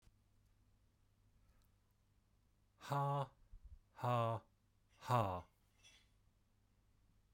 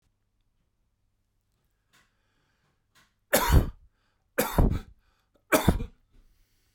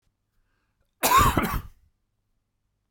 exhalation_length: 7.3 s
exhalation_amplitude: 2348
exhalation_signal_mean_std_ratio: 0.36
three_cough_length: 6.7 s
three_cough_amplitude: 16805
three_cough_signal_mean_std_ratio: 0.29
cough_length: 2.9 s
cough_amplitude: 14951
cough_signal_mean_std_ratio: 0.34
survey_phase: beta (2021-08-13 to 2022-03-07)
age: 45-64
gender: Male
wearing_mask: 'No'
symptom_none: true
symptom_onset: 11 days
smoker_status: Never smoked
respiratory_condition_asthma: false
respiratory_condition_other: false
recruitment_source: REACT
submission_delay: 1 day
covid_test_result: Negative
covid_test_method: RT-qPCR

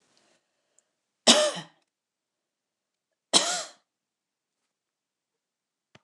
cough_length: 6.0 s
cough_amplitude: 23429
cough_signal_mean_std_ratio: 0.21
survey_phase: beta (2021-08-13 to 2022-03-07)
age: 65+
gender: Female
wearing_mask: 'No'
symptom_none: true
smoker_status: Ex-smoker
respiratory_condition_asthma: false
respiratory_condition_other: false
recruitment_source: REACT
submission_delay: 1 day
covid_test_result: Negative
covid_test_method: RT-qPCR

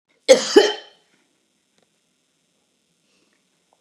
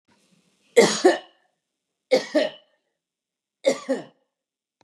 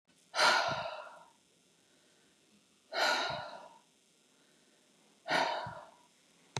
cough_length: 3.8 s
cough_amplitude: 32768
cough_signal_mean_std_ratio: 0.22
three_cough_length: 4.8 s
three_cough_amplitude: 24489
three_cough_signal_mean_std_ratio: 0.3
exhalation_length: 6.6 s
exhalation_amplitude: 6041
exhalation_signal_mean_std_ratio: 0.4
survey_phase: beta (2021-08-13 to 2022-03-07)
age: 65+
gender: Female
wearing_mask: 'No'
symptom_runny_or_blocked_nose: true
symptom_fatigue: true
smoker_status: Ex-smoker
respiratory_condition_asthma: false
respiratory_condition_other: false
recruitment_source: REACT
submission_delay: 2 days
covid_test_result: Negative
covid_test_method: RT-qPCR
influenza_a_test_result: Negative
influenza_b_test_result: Negative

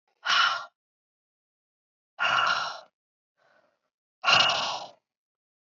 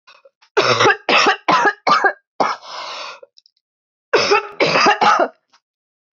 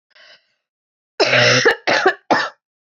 exhalation_length: 5.6 s
exhalation_amplitude: 15100
exhalation_signal_mean_std_ratio: 0.4
three_cough_length: 6.1 s
three_cough_amplitude: 25514
three_cough_signal_mean_std_ratio: 0.54
cough_length: 2.9 s
cough_amplitude: 25936
cough_signal_mean_std_ratio: 0.49
survey_phase: beta (2021-08-13 to 2022-03-07)
age: 18-44
gender: Female
wearing_mask: 'No'
symptom_cough_any: true
symptom_runny_or_blocked_nose: true
symptom_sore_throat: true
symptom_diarrhoea: true
symptom_fatigue: true
symptom_fever_high_temperature: true
symptom_headache: true
smoker_status: Never smoked
respiratory_condition_asthma: false
respiratory_condition_other: false
recruitment_source: Test and Trace
submission_delay: 2 days
covid_test_result: Positive
covid_test_method: RT-qPCR
covid_ct_value: 21.1
covid_ct_gene: ORF1ab gene
covid_ct_mean: 21.5
covid_viral_load: 89000 copies/ml
covid_viral_load_category: Low viral load (10K-1M copies/ml)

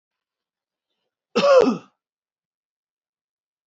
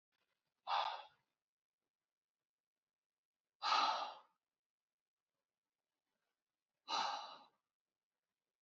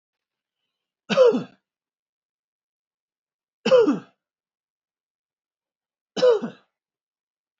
cough_length: 3.7 s
cough_amplitude: 21053
cough_signal_mean_std_ratio: 0.27
exhalation_length: 8.6 s
exhalation_amplitude: 2081
exhalation_signal_mean_std_ratio: 0.29
three_cough_length: 7.6 s
three_cough_amplitude: 16933
three_cough_signal_mean_std_ratio: 0.27
survey_phase: alpha (2021-03-01 to 2021-08-12)
age: 18-44
gender: Male
wearing_mask: 'No'
symptom_cough_any: true
symptom_fatigue: true
smoker_status: Never smoked
respiratory_condition_asthma: true
respiratory_condition_other: false
recruitment_source: Test and Trace
submission_delay: 2 days
covid_test_result: Positive
covid_test_method: RT-qPCR
covid_ct_value: 34.4
covid_ct_gene: ORF1ab gene
covid_ct_mean: 35.5
covid_viral_load: 2.3 copies/ml
covid_viral_load_category: Minimal viral load (< 10K copies/ml)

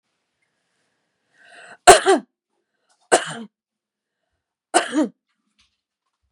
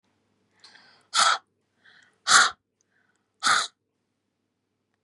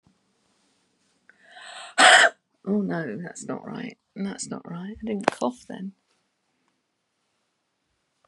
three_cough_length: 6.3 s
three_cough_amplitude: 32768
three_cough_signal_mean_std_ratio: 0.22
exhalation_length: 5.0 s
exhalation_amplitude: 22775
exhalation_signal_mean_std_ratio: 0.28
cough_length: 8.3 s
cough_amplitude: 27773
cough_signal_mean_std_ratio: 0.32
survey_phase: beta (2021-08-13 to 2022-03-07)
age: 45-64
gender: Female
wearing_mask: 'No'
symptom_none: true
smoker_status: Never smoked
respiratory_condition_asthma: false
respiratory_condition_other: false
recruitment_source: REACT
submission_delay: 2 days
covid_test_result: Negative
covid_test_method: RT-qPCR
influenza_a_test_result: Negative
influenza_b_test_result: Negative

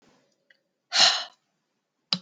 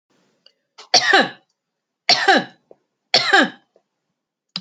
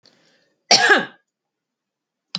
exhalation_length: 2.2 s
exhalation_amplitude: 20788
exhalation_signal_mean_std_ratio: 0.29
three_cough_length: 4.6 s
three_cough_amplitude: 30975
three_cough_signal_mean_std_ratio: 0.36
cough_length: 2.4 s
cough_amplitude: 31070
cough_signal_mean_std_ratio: 0.29
survey_phase: alpha (2021-03-01 to 2021-08-12)
age: 45-64
gender: Female
wearing_mask: 'No'
symptom_none: true
smoker_status: Never smoked
respiratory_condition_asthma: false
respiratory_condition_other: false
recruitment_source: REACT
submission_delay: 1 day
covid_test_result: Negative
covid_test_method: RT-qPCR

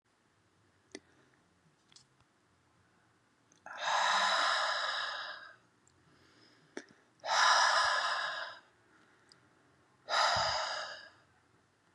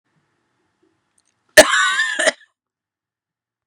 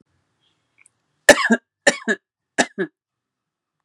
exhalation_length: 11.9 s
exhalation_amplitude: 5549
exhalation_signal_mean_std_ratio: 0.46
cough_length: 3.7 s
cough_amplitude: 32768
cough_signal_mean_std_ratio: 0.28
three_cough_length: 3.8 s
three_cough_amplitude: 32768
three_cough_signal_mean_std_ratio: 0.24
survey_phase: beta (2021-08-13 to 2022-03-07)
age: 18-44
gender: Female
wearing_mask: 'No'
symptom_none: true
smoker_status: Ex-smoker
respiratory_condition_asthma: false
respiratory_condition_other: false
recruitment_source: REACT
submission_delay: 1 day
covid_test_result: Negative
covid_test_method: RT-qPCR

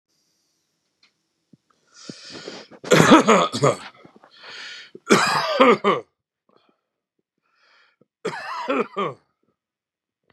cough_length: 10.3 s
cough_amplitude: 32767
cough_signal_mean_std_ratio: 0.34
survey_phase: beta (2021-08-13 to 2022-03-07)
age: 45-64
gender: Male
wearing_mask: 'No'
symptom_cough_any: true
symptom_shortness_of_breath: true
symptom_fatigue: true
symptom_onset: 12 days
smoker_status: Ex-smoker
respiratory_condition_asthma: false
respiratory_condition_other: false
recruitment_source: REACT
submission_delay: -1 day
covid_test_result: Negative
covid_test_method: RT-qPCR
influenza_a_test_result: Negative
influenza_b_test_result: Negative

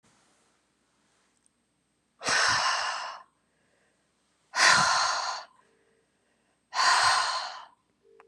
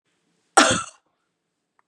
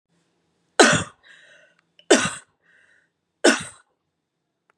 exhalation_length: 8.3 s
exhalation_amplitude: 15569
exhalation_signal_mean_std_ratio: 0.44
cough_length: 1.9 s
cough_amplitude: 32759
cough_signal_mean_std_ratio: 0.26
three_cough_length: 4.8 s
three_cough_amplitude: 32652
three_cough_signal_mean_std_ratio: 0.26
survey_phase: beta (2021-08-13 to 2022-03-07)
age: 45-64
gender: Female
wearing_mask: 'No'
symptom_none: true
smoker_status: Never smoked
respiratory_condition_asthma: false
respiratory_condition_other: false
recruitment_source: REACT
submission_delay: 1 day
covid_test_result: Negative
covid_test_method: RT-qPCR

